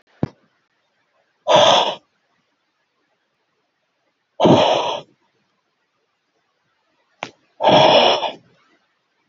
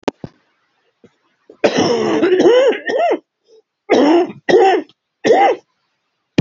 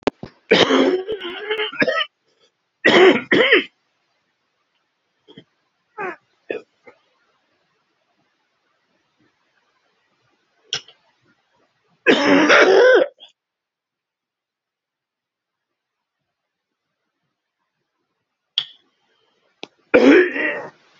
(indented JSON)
{
  "exhalation_length": "9.3 s",
  "exhalation_amplitude": 29715,
  "exhalation_signal_mean_std_ratio": 0.34,
  "cough_length": "6.4 s",
  "cough_amplitude": 32768,
  "cough_signal_mean_std_ratio": 0.57,
  "three_cough_length": "21.0 s",
  "three_cough_amplitude": 30746,
  "three_cough_signal_mean_std_ratio": 0.32,
  "survey_phase": "beta (2021-08-13 to 2022-03-07)",
  "age": "65+",
  "gender": "Male",
  "wearing_mask": "No",
  "symptom_new_continuous_cough": true,
  "symptom_runny_or_blocked_nose": true,
  "symptom_shortness_of_breath": true,
  "symptom_change_to_sense_of_smell_or_taste": true,
  "symptom_loss_of_taste": true,
  "symptom_onset": "3 days",
  "smoker_status": "Ex-smoker",
  "respiratory_condition_asthma": false,
  "respiratory_condition_other": false,
  "recruitment_source": "Test and Trace",
  "submission_delay": "1 day",
  "covid_test_result": "Positive",
  "covid_test_method": "ePCR"
}